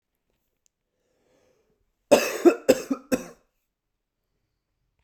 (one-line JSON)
{"cough_length": "5.0 s", "cough_amplitude": 25088, "cough_signal_mean_std_ratio": 0.23, "survey_phase": "beta (2021-08-13 to 2022-03-07)", "age": "18-44", "gender": "Male", "wearing_mask": "No", "symptom_none": true, "symptom_onset": "7 days", "smoker_status": "Never smoked", "respiratory_condition_asthma": false, "respiratory_condition_other": false, "recruitment_source": "REACT", "submission_delay": "1 day", "covid_test_result": "Negative", "covid_test_method": "RT-qPCR"}